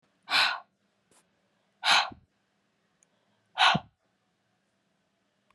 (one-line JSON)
{"exhalation_length": "5.5 s", "exhalation_amplitude": 13344, "exhalation_signal_mean_std_ratio": 0.28, "survey_phase": "beta (2021-08-13 to 2022-03-07)", "age": "18-44", "gender": "Female", "wearing_mask": "No", "symptom_cough_any": true, "symptom_runny_or_blocked_nose": true, "symptom_sore_throat": true, "symptom_headache": true, "symptom_onset": "3 days", "smoker_status": "Never smoked", "respiratory_condition_asthma": false, "respiratory_condition_other": false, "recruitment_source": "Test and Trace", "submission_delay": "1 day", "covid_test_result": "Positive", "covid_test_method": "RT-qPCR", "covid_ct_value": 27.7, "covid_ct_gene": "N gene"}